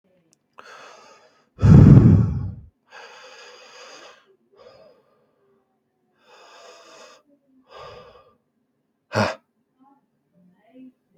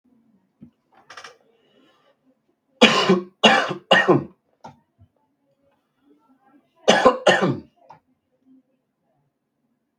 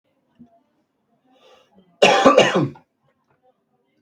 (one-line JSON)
{"exhalation_length": "11.2 s", "exhalation_amplitude": 32768, "exhalation_signal_mean_std_ratio": 0.24, "three_cough_length": "10.0 s", "three_cough_amplitude": 32768, "three_cough_signal_mean_std_ratio": 0.3, "cough_length": "4.0 s", "cough_amplitude": 32768, "cough_signal_mean_std_ratio": 0.31, "survey_phase": "beta (2021-08-13 to 2022-03-07)", "age": "18-44", "gender": "Male", "wearing_mask": "No", "symptom_shortness_of_breath": true, "symptom_headache": true, "smoker_status": "Ex-smoker", "respiratory_condition_asthma": false, "respiratory_condition_other": false, "recruitment_source": "REACT", "submission_delay": "2 days", "covid_test_result": "Negative", "covid_test_method": "RT-qPCR", "influenza_a_test_result": "Negative", "influenza_b_test_result": "Negative"}